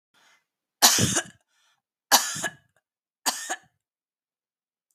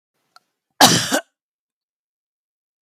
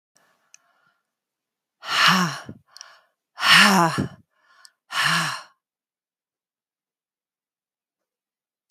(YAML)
three_cough_length: 4.9 s
three_cough_amplitude: 32768
three_cough_signal_mean_std_ratio: 0.29
cough_length: 2.8 s
cough_amplitude: 32768
cough_signal_mean_std_ratio: 0.25
exhalation_length: 8.7 s
exhalation_amplitude: 28133
exhalation_signal_mean_std_ratio: 0.32
survey_phase: beta (2021-08-13 to 2022-03-07)
age: 65+
gender: Female
wearing_mask: 'No'
symptom_none: true
smoker_status: Never smoked
respiratory_condition_asthma: false
respiratory_condition_other: false
recruitment_source: REACT
submission_delay: 6 days
covid_test_result: Negative
covid_test_method: RT-qPCR